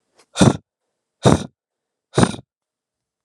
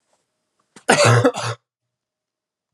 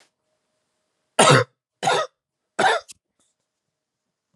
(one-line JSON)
{"exhalation_length": "3.2 s", "exhalation_amplitude": 32768, "exhalation_signal_mean_std_ratio": 0.27, "cough_length": "2.7 s", "cough_amplitude": 31304, "cough_signal_mean_std_ratio": 0.36, "three_cough_length": "4.4 s", "three_cough_amplitude": 31247, "three_cough_signal_mean_std_ratio": 0.3, "survey_phase": "alpha (2021-03-01 to 2021-08-12)", "age": "18-44", "gender": "Male", "wearing_mask": "No", "symptom_cough_any": true, "symptom_fatigue": true, "symptom_fever_high_temperature": true, "symptom_headache": true, "smoker_status": "Never smoked", "respiratory_condition_asthma": false, "respiratory_condition_other": false, "recruitment_source": "Test and Trace", "submission_delay": "3 days", "covid_test_result": "Positive", "covid_test_method": "RT-qPCR"}